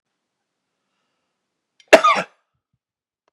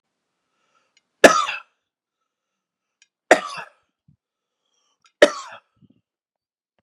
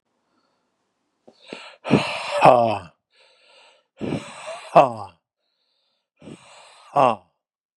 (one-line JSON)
{"cough_length": "3.3 s", "cough_amplitude": 32768, "cough_signal_mean_std_ratio": 0.19, "three_cough_length": "6.8 s", "three_cough_amplitude": 32768, "three_cough_signal_mean_std_ratio": 0.18, "exhalation_length": "7.8 s", "exhalation_amplitude": 32768, "exhalation_signal_mean_std_ratio": 0.3, "survey_phase": "beta (2021-08-13 to 2022-03-07)", "age": "45-64", "gender": "Male", "wearing_mask": "No", "symptom_diarrhoea": true, "symptom_fatigue": true, "smoker_status": "Ex-smoker", "respiratory_condition_asthma": false, "respiratory_condition_other": false, "recruitment_source": "REACT", "submission_delay": "1 day", "covid_test_result": "Negative", "covid_test_method": "RT-qPCR"}